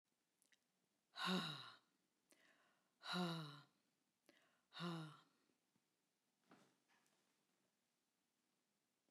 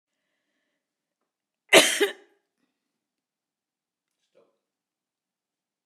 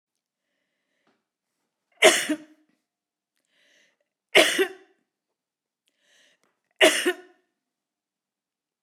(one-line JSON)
{"exhalation_length": "9.1 s", "exhalation_amplitude": 843, "exhalation_signal_mean_std_ratio": 0.32, "cough_length": "5.9 s", "cough_amplitude": 27933, "cough_signal_mean_std_ratio": 0.16, "three_cough_length": "8.8 s", "three_cough_amplitude": 32488, "three_cough_signal_mean_std_ratio": 0.23, "survey_phase": "beta (2021-08-13 to 2022-03-07)", "age": "65+", "gender": "Female", "wearing_mask": "No", "symptom_none": true, "smoker_status": "Ex-smoker", "respiratory_condition_asthma": false, "respiratory_condition_other": false, "recruitment_source": "REACT", "submission_delay": "2 days", "covid_test_result": "Negative", "covid_test_method": "RT-qPCR", "influenza_a_test_result": "Negative", "influenza_b_test_result": "Negative"}